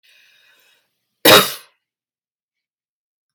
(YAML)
cough_length: 3.3 s
cough_amplitude: 32768
cough_signal_mean_std_ratio: 0.21
survey_phase: beta (2021-08-13 to 2022-03-07)
age: 45-64
gender: Female
wearing_mask: 'No'
symptom_runny_or_blocked_nose: true
symptom_onset: 12 days
smoker_status: Ex-smoker
respiratory_condition_asthma: false
respiratory_condition_other: false
recruitment_source: REACT
submission_delay: 1 day
covid_test_result: Negative
covid_test_method: RT-qPCR
influenza_a_test_result: Negative
influenza_b_test_result: Negative